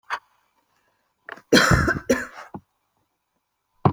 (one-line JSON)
{"cough_length": "3.9 s", "cough_amplitude": 27503, "cough_signal_mean_std_ratio": 0.33, "survey_phase": "beta (2021-08-13 to 2022-03-07)", "age": "18-44", "gender": "Female", "wearing_mask": "No", "symptom_none": true, "smoker_status": "Never smoked", "respiratory_condition_asthma": false, "respiratory_condition_other": false, "recruitment_source": "REACT", "submission_delay": "3 days", "covid_test_result": "Negative", "covid_test_method": "RT-qPCR"}